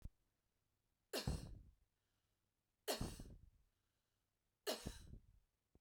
{"three_cough_length": "5.8 s", "three_cough_amplitude": 1264, "three_cough_signal_mean_std_ratio": 0.35, "survey_phase": "beta (2021-08-13 to 2022-03-07)", "age": "18-44", "gender": "Female", "wearing_mask": "No", "symptom_runny_or_blocked_nose": true, "symptom_sore_throat": true, "symptom_fatigue": true, "symptom_headache": true, "symptom_change_to_sense_of_smell_or_taste": true, "smoker_status": "Current smoker (1 to 10 cigarettes per day)", "respiratory_condition_asthma": false, "respiratory_condition_other": false, "recruitment_source": "Test and Trace", "submission_delay": "2 days", "covid_test_result": "Positive", "covid_test_method": "RT-qPCR", "covid_ct_value": 35.1, "covid_ct_gene": "N gene"}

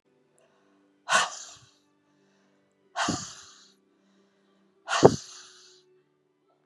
{"exhalation_length": "6.7 s", "exhalation_amplitude": 30107, "exhalation_signal_mean_std_ratio": 0.23, "survey_phase": "beta (2021-08-13 to 2022-03-07)", "age": "45-64", "gender": "Female", "wearing_mask": "No", "symptom_cough_any": true, "symptom_runny_or_blocked_nose": true, "symptom_fatigue": true, "symptom_onset": "2 days", "smoker_status": "Ex-smoker", "respiratory_condition_asthma": false, "respiratory_condition_other": false, "recruitment_source": "Test and Trace", "submission_delay": "1 day", "covid_test_result": "Positive", "covid_test_method": "RT-qPCR", "covid_ct_value": 21.3, "covid_ct_gene": "N gene"}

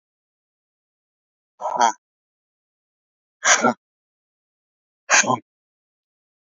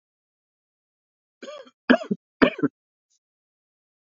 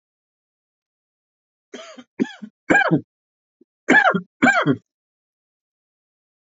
{"exhalation_length": "6.6 s", "exhalation_amplitude": 29812, "exhalation_signal_mean_std_ratio": 0.25, "three_cough_length": "4.0 s", "three_cough_amplitude": 26988, "three_cough_signal_mean_std_ratio": 0.2, "cough_length": "6.5 s", "cough_amplitude": 27418, "cough_signal_mean_std_ratio": 0.31, "survey_phase": "alpha (2021-03-01 to 2021-08-12)", "age": "18-44", "gender": "Male", "wearing_mask": "No", "symptom_cough_any": true, "symptom_headache": true, "smoker_status": "Never smoked", "respiratory_condition_asthma": false, "respiratory_condition_other": true, "recruitment_source": "Test and Trace", "submission_delay": "2 days", "covid_test_result": "Positive", "covid_test_method": "RT-qPCR", "covid_ct_value": 27.2, "covid_ct_gene": "ORF1ab gene", "covid_ct_mean": 28.3, "covid_viral_load": "540 copies/ml", "covid_viral_load_category": "Minimal viral load (< 10K copies/ml)"}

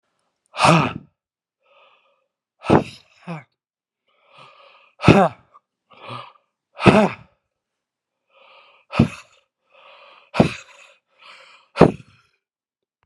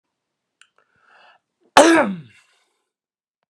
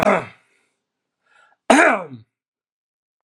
{"exhalation_length": "13.1 s", "exhalation_amplitude": 32768, "exhalation_signal_mean_std_ratio": 0.25, "three_cough_length": "3.5 s", "three_cough_amplitude": 32768, "three_cough_signal_mean_std_ratio": 0.24, "cough_length": "3.2 s", "cough_amplitude": 32767, "cough_signal_mean_std_ratio": 0.31, "survey_phase": "beta (2021-08-13 to 2022-03-07)", "age": "45-64", "gender": "Male", "wearing_mask": "No", "symptom_runny_or_blocked_nose": true, "symptom_headache": true, "smoker_status": "Ex-smoker", "respiratory_condition_asthma": false, "respiratory_condition_other": false, "recruitment_source": "REACT", "submission_delay": "1 day", "covid_test_result": "Negative", "covid_test_method": "RT-qPCR"}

